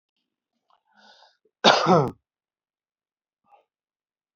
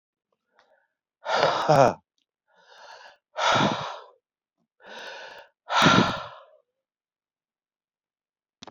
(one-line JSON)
{"cough_length": "4.4 s", "cough_amplitude": 28971, "cough_signal_mean_std_ratio": 0.24, "exhalation_length": "8.7 s", "exhalation_amplitude": 20263, "exhalation_signal_mean_std_ratio": 0.34, "survey_phase": "beta (2021-08-13 to 2022-03-07)", "age": "45-64", "gender": "Male", "wearing_mask": "No", "symptom_none": true, "smoker_status": "Current smoker (11 or more cigarettes per day)", "respiratory_condition_asthma": false, "respiratory_condition_other": false, "recruitment_source": "REACT", "submission_delay": "1 day", "covid_test_result": "Negative", "covid_test_method": "RT-qPCR"}